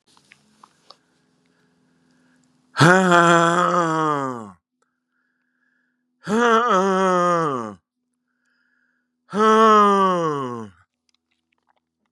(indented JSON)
{
  "exhalation_length": "12.1 s",
  "exhalation_amplitude": 32767,
  "exhalation_signal_mean_std_ratio": 0.44,
  "survey_phase": "beta (2021-08-13 to 2022-03-07)",
  "age": "65+",
  "gender": "Male",
  "wearing_mask": "No",
  "symptom_cough_any": true,
  "symptom_runny_or_blocked_nose": true,
  "smoker_status": "Never smoked",
  "respiratory_condition_asthma": false,
  "respiratory_condition_other": false,
  "recruitment_source": "REACT",
  "submission_delay": "3 days",
  "covid_test_result": "Negative",
  "covid_test_method": "RT-qPCR",
  "influenza_a_test_result": "Negative",
  "influenza_b_test_result": "Negative"
}